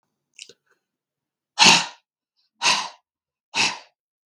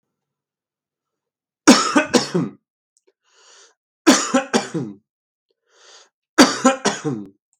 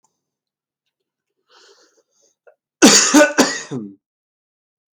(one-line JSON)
{"exhalation_length": "4.3 s", "exhalation_amplitude": 32768, "exhalation_signal_mean_std_ratio": 0.29, "three_cough_length": "7.6 s", "three_cough_amplitude": 32768, "three_cough_signal_mean_std_ratio": 0.34, "cough_length": "4.9 s", "cough_amplitude": 32768, "cough_signal_mean_std_ratio": 0.3, "survey_phase": "beta (2021-08-13 to 2022-03-07)", "age": "18-44", "gender": "Male", "wearing_mask": "No", "symptom_cough_any": true, "symptom_fatigue": true, "symptom_onset": "5 days", "smoker_status": "Never smoked", "respiratory_condition_asthma": false, "respiratory_condition_other": false, "recruitment_source": "Test and Trace", "submission_delay": "1 day", "covid_test_result": "Negative", "covid_test_method": "RT-qPCR"}